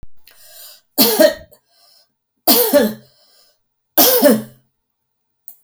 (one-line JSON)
{"three_cough_length": "5.6 s", "three_cough_amplitude": 32768, "three_cough_signal_mean_std_ratio": 0.4, "survey_phase": "beta (2021-08-13 to 2022-03-07)", "age": "65+", "gender": "Female", "wearing_mask": "No", "symptom_none": true, "symptom_onset": "7 days", "smoker_status": "Never smoked", "respiratory_condition_asthma": false, "respiratory_condition_other": false, "recruitment_source": "REACT", "submission_delay": "0 days", "covid_test_result": "Negative", "covid_test_method": "RT-qPCR", "influenza_a_test_result": "Negative", "influenza_b_test_result": "Negative"}